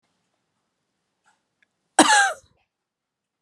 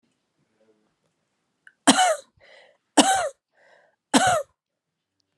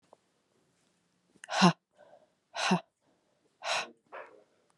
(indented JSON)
{
  "cough_length": "3.4 s",
  "cough_amplitude": 31789,
  "cough_signal_mean_std_ratio": 0.24,
  "three_cough_length": "5.4 s",
  "three_cough_amplitude": 32565,
  "three_cough_signal_mean_std_ratio": 0.31,
  "exhalation_length": "4.8 s",
  "exhalation_amplitude": 12891,
  "exhalation_signal_mean_std_ratio": 0.27,
  "survey_phase": "beta (2021-08-13 to 2022-03-07)",
  "age": "18-44",
  "gender": "Female",
  "wearing_mask": "No",
  "symptom_cough_any": true,
  "symptom_runny_or_blocked_nose": true,
  "symptom_fatigue": true,
  "symptom_headache": true,
  "symptom_other": true,
  "symptom_onset": "4 days",
  "smoker_status": "Never smoked",
  "respiratory_condition_asthma": false,
  "respiratory_condition_other": false,
  "recruitment_source": "Test and Trace",
  "submission_delay": "1 day",
  "covid_test_result": "Positive",
  "covid_test_method": "ePCR"
}